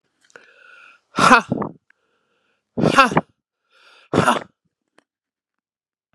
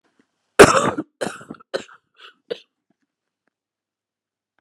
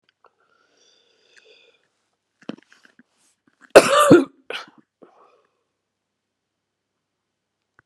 exhalation_length: 6.1 s
exhalation_amplitude: 32768
exhalation_signal_mean_std_ratio: 0.29
three_cough_length: 4.6 s
three_cough_amplitude: 32768
three_cough_signal_mean_std_ratio: 0.21
cough_length: 7.9 s
cough_amplitude: 32768
cough_signal_mean_std_ratio: 0.19
survey_phase: beta (2021-08-13 to 2022-03-07)
age: 45-64
gender: Female
wearing_mask: 'No'
symptom_cough_any: true
symptom_shortness_of_breath: true
symptom_sore_throat: true
symptom_fatigue: true
symptom_change_to_sense_of_smell_or_taste: true
symptom_loss_of_taste: true
smoker_status: Ex-smoker
respiratory_condition_asthma: true
respiratory_condition_other: false
recruitment_source: Test and Trace
submission_delay: 1 day
covid_test_result: Positive
covid_test_method: LFT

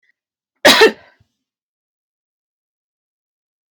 cough_length: 3.7 s
cough_amplitude: 32767
cough_signal_mean_std_ratio: 0.22
survey_phase: alpha (2021-03-01 to 2021-08-12)
age: 18-44
gender: Female
wearing_mask: 'No'
symptom_none: true
smoker_status: Never smoked
respiratory_condition_asthma: false
respiratory_condition_other: false
recruitment_source: REACT
submission_delay: 1 day
covid_test_result: Negative
covid_test_method: RT-qPCR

